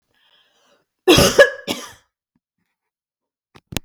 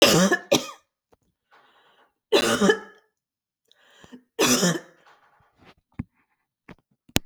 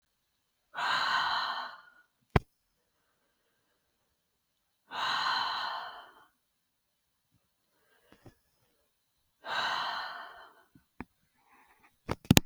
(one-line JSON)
{"cough_length": "3.8 s", "cough_amplitude": 32768, "cough_signal_mean_std_ratio": 0.27, "three_cough_length": "7.3 s", "three_cough_amplitude": 32762, "three_cough_signal_mean_std_ratio": 0.34, "exhalation_length": "12.5 s", "exhalation_amplitude": 32768, "exhalation_signal_mean_std_ratio": 0.32, "survey_phase": "beta (2021-08-13 to 2022-03-07)", "age": "65+", "gender": "Female", "wearing_mask": "No", "symptom_none": true, "smoker_status": "Ex-smoker", "respiratory_condition_asthma": false, "respiratory_condition_other": false, "recruitment_source": "REACT", "submission_delay": "0 days", "covid_test_result": "Negative", "covid_test_method": "RT-qPCR", "influenza_a_test_result": "Unknown/Void", "influenza_b_test_result": "Unknown/Void"}